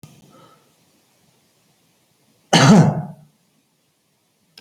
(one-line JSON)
{"cough_length": "4.6 s", "cough_amplitude": 30927, "cough_signal_mean_std_ratio": 0.27, "survey_phase": "alpha (2021-03-01 to 2021-08-12)", "age": "65+", "gender": "Male", "wearing_mask": "No", "symptom_none": true, "symptom_onset": "12 days", "smoker_status": "Never smoked", "respiratory_condition_asthma": false, "respiratory_condition_other": false, "recruitment_source": "REACT", "submission_delay": "1 day", "covid_test_result": "Negative", "covid_test_method": "RT-qPCR"}